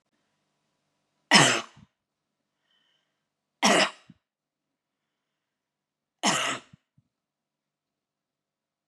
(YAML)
three_cough_length: 8.9 s
three_cough_amplitude: 29211
three_cough_signal_mean_std_ratio: 0.23
survey_phase: beta (2021-08-13 to 2022-03-07)
age: 65+
gender: Female
wearing_mask: 'No'
symptom_none: true
smoker_status: Never smoked
respiratory_condition_asthma: false
respiratory_condition_other: true
recruitment_source: REACT
submission_delay: 4 days
covid_test_result: Negative
covid_test_method: RT-qPCR